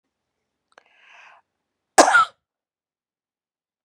{"cough_length": "3.8 s", "cough_amplitude": 32768, "cough_signal_mean_std_ratio": 0.2, "survey_phase": "beta (2021-08-13 to 2022-03-07)", "age": "45-64", "gender": "Female", "wearing_mask": "No", "symptom_none": true, "smoker_status": "Never smoked", "respiratory_condition_asthma": false, "respiratory_condition_other": false, "recruitment_source": "REACT", "submission_delay": "2 days", "covid_test_result": "Negative", "covid_test_method": "RT-qPCR"}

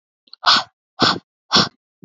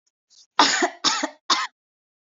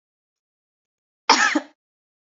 {"exhalation_length": "2.0 s", "exhalation_amplitude": 32767, "exhalation_signal_mean_std_ratio": 0.38, "three_cough_length": "2.2 s", "three_cough_amplitude": 27791, "three_cough_signal_mean_std_ratio": 0.43, "cough_length": "2.2 s", "cough_amplitude": 28610, "cough_signal_mean_std_ratio": 0.27, "survey_phase": "beta (2021-08-13 to 2022-03-07)", "age": "18-44", "gender": "Female", "wearing_mask": "No", "symptom_fatigue": true, "smoker_status": "Never smoked", "respiratory_condition_asthma": false, "respiratory_condition_other": false, "recruitment_source": "REACT", "submission_delay": "5 days", "covid_test_result": "Negative", "covid_test_method": "RT-qPCR"}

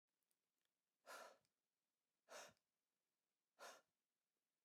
{"exhalation_length": "4.6 s", "exhalation_amplitude": 144, "exhalation_signal_mean_std_ratio": 0.32, "survey_phase": "beta (2021-08-13 to 2022-03-07)", "age": "45-64", "gender": "Female", "wearing_mask": "No", "symptom_none": true, "smoker_status": "Never smoked", "respiratory_condition_asthma": false, "respiratory_condition_other": false, "recruitment_source": "REACT", "submission_delay": "2 days", "covid_test_result": "Negative", "covid_test_method": "RT-qPCR"}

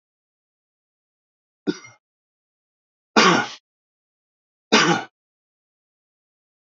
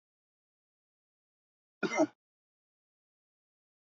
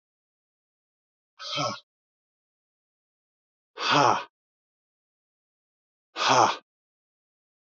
{"three_cough_length": "6.7 s", "three_cough_amplitude": 28981, "three_cough_signal_mean_std_ratio": 0.24, "cough_length": "3.9 s", "cough_amplitude": 5668, "cough_signal_mean_std_ratio": 0.17, "exhalation_length": "7.8 s", "exhalation_amplitude": 16494, "exhalation_signal_mean_std_ratio": 0.27, "survey_phase": "beta (2021-08-13 to 2022-03-07)", "age": "45-64", "gender": "Male", "wearing_mask": "No", "symptom_none": true, "smoker_status": "Never smoked", "respiratory_condition_asthma": false, "respiratory_condition_other": false, "recruitment_source": "REACT", "submission_delay": "2 days", "covid_test_result": "Negative", "covid_test_method": "RT-qPCR", "influenza_a_test_result": "Negative", "influenza_b_test_result": "Negative"}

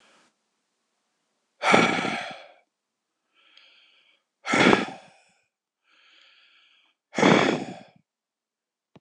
{"exhalation_length": "9.0 s", "exhalation_amplitude": 26027, "exhalation_signal_mean_std_ratio": 0.3, "survey_phase": "beta (2021-08-13 to 2022-03-07)", "age": "45-64", "gender": "Male", "wearing_mask": "No", "symptom_cough_any": true, "symptom_runny_or_blocked_nose": true, "symptom_change_to_sense_of_smell_or_taste": true, "symptom_loss_of_taste": true, "symptom_onset": "4 days", "smoker_status": "Ex-smoker", "respiratory_condition_asthma": false, "respiratory_condition_other": false, "recruitment_source": "Test and Trace", "submission_delay": "2 days", "covid_test_result": "Positive", "covid_test_method": "RT-qPCR"}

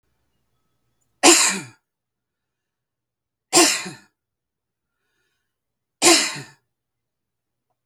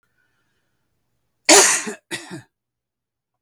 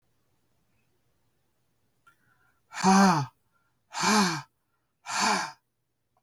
{"three_cough_length": "7.9 s", "three_cough_amplitude": 32768, "three_cough_signal_mean_std_ratio": 0.26, "cough_length": "3.4 s", "cough_amplitude": 32768, "cough_signal_mean_std_ratio": 0.26, "exhalation_length": "6.2 s", "exhalation_amplitude": 12402, "exhalation_signal_mean_std_ratio": 0.36, "survey_phase": "beta (2021-08-13 to 2022-03-07)", "age": "45-64", "gender": "Male", "wearing_mask": "No", "symptom_cough_any": true, "symptom_shortness_of_breath": true, "symptom_fatigue": true, "symptom_onset": "8 days", "smoker_status": "Never smoked", "respiratory_condition_asthma": false, "respiratory_condition_other": false, "recruitment_source": "REACT", "submission_delay": "0 days", "covid_test_result": "Negative", "covid_test_method": "RT-qPCR"}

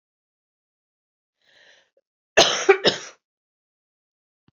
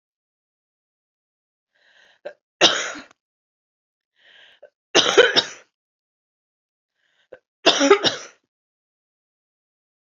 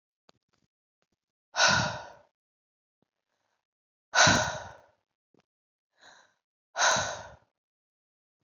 {"cough_length": "4.5 s", "cough_amplitude": 29215, "cough_signal_mean_std_ratio": 0.23, "three_cough_length": "10.2 s", "three_cough_amplitude": 32768, "three_cough_signal_mean_std_ratio": 0.24, "exhalation_length": "8.5 s", "exhalation_amplitude": 14145, "exhalation_signal_mean_std_ratio": 0.29, "survey_phase": "beta (2021-08-13 to 2022-03-07)", "age": "45-64", "gender": "Female", "wearing_mask": "No", "symptom_cough_any": true, "symptom_runny_or_blocked_nose": true, "symptom_fatigue": true, "symptom_fever_high_temperature": true, "symptom_headache": true, "symptom_other": true, "smoker_status": "Current smoker (1 to 10 cigarettes per day)", "respiratory_condition_asthma": false, "respiratory_condition_other": false, "recruitment_source": "Test and Trace", "submission_delay": "2 days", "covid_test_result": "Positive", "covid_test_method": "RT-qPCR"}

